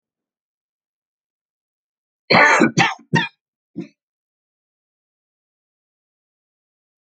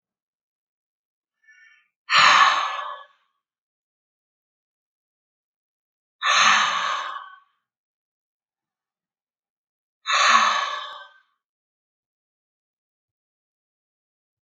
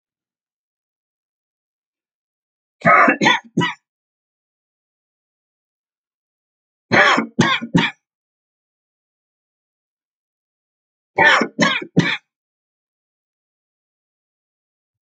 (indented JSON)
{
  "cough_length": "7.1 s",
  "cough_amplitude": 28608,
  "cough_signal_mean_std_ratio": 0.24,
  "exhalation_length": "14.4 s",
  "exhalation_amplitude": 24397,
  "exhalation_signal_mean_std_ratio": 0.31,
  "three_cough_length": "15.0 s",
  "three_cough_amplitude": 32768,
  "three_cough_signal_mean_std_ratio": 0.28,
  "survey_phase": "alpha (2021-03-01 to 2021-08-12)",
  "age": "45-64",
  "gender": "Male",
  "wearing_mask": "No",
  "symptom_none": true,
  "smoker_status": "Never smoked",
  "respiratory_condition_asthma": false,
  "respiratory_condition_other": false,
  "recruitment_source": "REACT",
  "submission_delay": "2 days",
  "covid_test_result": "Negative",
  "covid_test_method": "RT-qPCR"
}